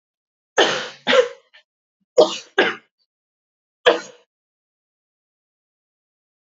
{
  "three_cough_length": "6.6 s",
  "three_cough_amplitude": 28971,
  "three_cough_signal_mean_std_ratio": 0.27,
  "survey_phase": "alpha (2021-03-01 to 2021-08-12)",
  "age": "18-44",
  "gender": "Female",
  "wearing_mask": "No",
  "symptom_cough_any": true,
  "symptom_new_continuous_cough": true,
  "symptom_abdominal_pain": true,
  "symptom_diarrhoea": true,
  "symptom_fatigue": true,
  "symptom_fever_high_temperature": true,
  "symptom_headache": true,
  "symptom_onset": "3 days",
  "smoker_status": "Never smoked",
  "respiratory_condition_asthma": false,
  "respiratory_condition_other": false,
  "recruitment_source": "Test and Trace",
  "submission_delay": "1 day",
  "covid_test_result": "Positive",
  "covid_test_method": "RT-qPCR",
  "covid_ct_value": 15.2,
  "covid_ct_gene": "ORF1ab gene",
  "covid_ct_mean": 15.5,
  "covid_viral_load": "8400000 copies/ml",
  "covid_viral_load_category": "High viral load (>1M copies/ml)"
}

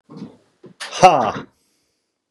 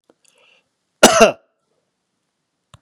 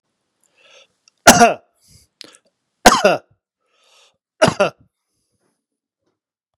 {
  "exhalation_length": "2.3 s",
  "exhalation_amplitude": 32768,
  "exhalation_signal_mean_std_ratio": 0.3,
  "cough_length": "2.8 s",
  "cough_amplitude": 32768,
  "cough_signal_mean_std_ratio": 0.23,
  "three_cough_length": "6.6 s",
  "three_cough_amplitude": 32768,
  "three_cough_signal_mean_std_ratio": 0.24,
  "survey_phase": "beta (2021-08-13 to 2022-03-07)",
  "age": "45-64",
  "gender": "Male",
  "wearing_mask": "No",
  "symptom_none": true,
  "smoker_status": "Never smoked",
  "respiratory_condition_asthma": true,
  "respiratory_condition_other": false,
  "recruitment_source": "REACT",
  "submission_delay": "2 days",
  "covid_test_result": "Negative",
  "covid_test_method": "RT-qPCR",
  "influenza_a_test_result": "Negative",
  "influenza_b_test_result": "Negative"
}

